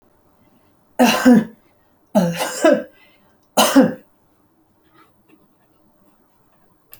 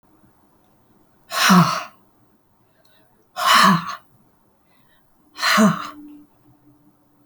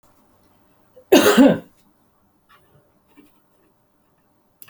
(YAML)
three_cough_length: 7.0 s
three_cough_amplitude: 32768
three_cough_signal_mean_std_ratio: 0.34
exhalation_length: 7.3 s
exhalation_amplitude: 27039
exhalation_signal_mean_std_ratio: 0.36
cough_length: 4.7 s
cough_amplitude: 31535
cough_signal_mean_std_ratio: 0.25
survey_phase: beta (2021-08-13 to 2022-03-07)
age: 65+
gender: Female
wearing_mask: 'No'
symptom_none: true
smoker_status: Ex-smoker
respiratory_condition_asthma: false
respiratory_condition_other: false
recruitment_source: REACT
submission_delay: 1 day
covid_test_result: Negative
covid_test_method: RT-qPCR